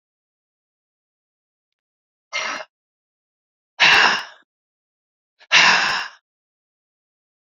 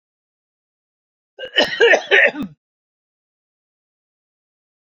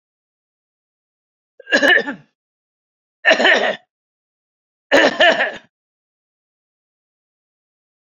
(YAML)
exhalation_length: 7.6 s
exhalation_amplitude: 29294
exhalation_signal_mean_std_ratio: 0.29
cough_length: 4.9 s
cough_amplitude: 28592
cough_signal_mean_std_ratio: 0.29
three_cough_length: 8.0 s
three_cough_amplitude: 28587
three_cough_signal_mean_std_ratio: 0.32
survey_phase: beta (2021-08-13 to 2022-03-07)
age: 45-64
gender: Male
wearing_mask: 'No'
symptom_cough_any: true
symptom_sore_throat: true
symptom_change_to_sense_of_smell_or_taste: true
smoker_status: Never smoked
respiratory_condition_asthma: false
respiratory_condition_other: false
recruitment_source: Test and Trace
submission_delay: 2 days
covid_test_result: Positive
covid_test_method: RT-qPCR
covid_ct_value: 29.8
covid_ct_gene: ORF1ab gene